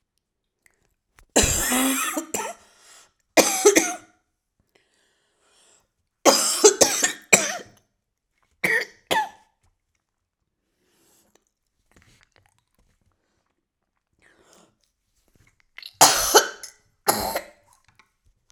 {"three_cough_length": "18.5 s", "three_cough_amplitude": 32768, "three_cough_signal_mean_std_ratio": 0.31, "survey_phase": "beta (2021-08-13 to 2022-03-07)", "age": "45-64", "gender": "Female", "wearing_mask": "No", "symptom_runny_or_blocked_nose": true, "symptom_sore_throat": true, "symptom_diarrhoea": true, "symptom_fatigue": true, "symptom_headache": true, "symptom_onset": "3 days", "smoker_status": "Never smoked", "respiratory_condition_asthma": false, "respiratory_condition_other": false, "recruitment_source": "Test and Trace", "submission_delay": "1 day", "covid_test_result": "Positive", "covid_test_method": "RT-qPCR", "covid_ct_value": 26.8, "covid_ct_gene": "ORF1ab gene"}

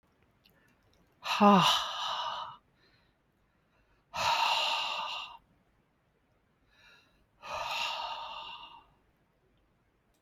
{"exhalation_length": "10.2 s", "exhalation_amplitude": 9075, "exhalation_signal_mean_std_ratio": 0.39, "survey_phase": "alpha (2021-03-01 to 2021-08-12)", "age": "45-64", "gender": "Female", "wearing_mask": "No", "symptom_none": true, "smoker_status": "Current smoker (1 to 10 cigarettes per day)", "respiratory_condition_asthma": false, "respiratory_condition_other": false, "recruitment_source": "Test and Trace", "submission_delay": "0 days", "covid_test_result": "Negative", "covid_test_method": "LFT"}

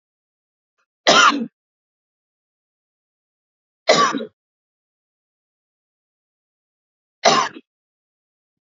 {"cough_length": "8.6 s", "cough_amplitude": 29608, "cough_signal_mean_std_ratio": 0.25, "survey_phase": "alpha (2021-03-01 to 2021-08-12)", "age": "45-64", "gender": "Female", "wearing_mask": "No", "symptom_none": true, "smoker_status": "Never smoked", "respiratory_condition_asthma": false, "respiratory_condition_other": false, "recruitment_source": "REACT", "submission_delay": "1 day", "covid_test_result": "Negative", "covid_test_method": "RT-qPCR"}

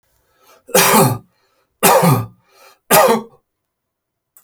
{"three_cough_length": "4.4 s", "three_cough_amplitude": 32768, "three_cough_signal_mean_std_ratio": 0.43, "survey_phase": "beta (2021-08-13 to 2022-03-07)", "age": "45-64", "gender": "Male", "wearing_mask": "No", "symptom_none": true, "smoker_status": "Ex-smoker", "respiratory_condition_asthma": false, "respiratory_condition_other": false, "recruitment_source": "REACT", "submission_delay": "1 day", "covid_test_result": "Negative", "covid_test_method": "RT-qPCR"}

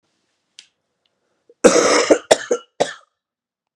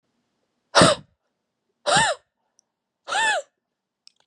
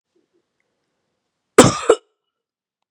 {"three_cough_length": "3.8 s", "three_cough_amplitude": 32768, "three_cough_signal_mean_std_ratio": 0.33, "exhalation_length": "4.3 s", "exhalation_amplitude": 29152, "exhalation_signal_mean_std_ratio": 0.33, "cough_length": "2.9 s", "cough_amplitude": 32768, "cough_signal_mean_std_ratio": 0.21, "survey_phase": "beta (2021-08-13 to 2022-03-07)", "age": "18-44", "gender": "Male", "wearing_mask": "No", "symptom_none": true, "smoker_status": "Current smoker (e-cigarettes or vapes only)", "respiratory_condition_asthma": false, "respiratory_condition_other": false, "recruitment_source": "Test and Trace", "submission_delay": "2 days", "covid_test_result": "Positive", "covid_test_method": "RT-qPCR", "covid_ct_value": 32.5, "covid_ct_gene": "ORF1ab gene"}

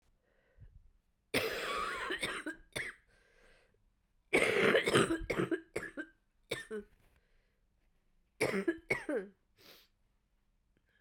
{"cough_length": "11.0 s", "cough_amplitude": 6653, "cough_signal_mean_std_ratio": 0.42, "survey_phase": "beta (2021-08-13 to 2022-03-07)", "age": "45-64", "gender": "Female", "wearing_mask": "No", "symptom_new_continuous_cough": true, "symptom_runny_or_blocked_nose": true, "symptom_sore_throat": true, "symptom_fatigue": true, "symptom_headache": true, "symptom_other": true, "smoker_status": "Ex-smoker", "respiratory_condition_asthma": false, "respiratory_condition_other": false, "recruitment_source": "Test and Trace", "submission_delay": "5 days", "covid_test_result": "Negative", "covid_test_method": "RT-qPCR"}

